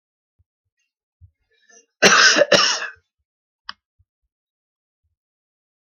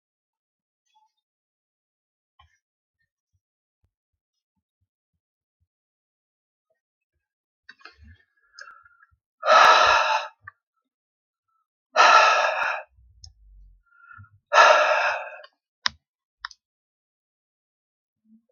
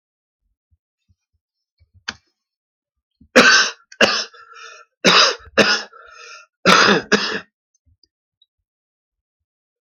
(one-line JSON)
{"cough_length": "5.9 s", "cough_amplitude": 30394, "cough_signal_mean_std_ratio": 0.27, "exhalation_length": "18.5 s", "exhalation_amplitude": 27301, "exhalation_signal_mean_std_ratio": 0.27, "three_cough_length": "9.8 s", "three_cough_amplitude": 32768, "three_cough_signal_mean_std_ratio": 0.33, "survey_phase": "alpha (2021-03-01 to 2021-08-12)", "age": "65+", "gender": "Male", "wearing_mask": "No", "symptom_none": true, "smoker_status": "Never smoked", "respiratory_condition_asthma": false, "respiratory_condition_other": false, "recruitment_source": "REACT", "submission_delay": "1 day", "covid_test_result": "Negative", "covid_test_method": "RT-qPCR"}